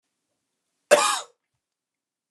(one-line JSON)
{"cough_length": "2.3 s", "cough_amplitude": 24574, "cough_signal_mean_std_ratio": 0.25, "survey_phase": "beta (2021-08-13 to 2022-03-07)", "age": "45-64", "gender": "Male", "wearing_mask": "No", "symptom_none": true, "smoker_status": "Never smoked", "respiratory_condition_asthma": false, "respiratory_condition_other": false, "recruitment_source": "REACT", "submission_delay": "3 days", "covid_test_result": "Negative", "covid_test_method": "RT-qPCR"}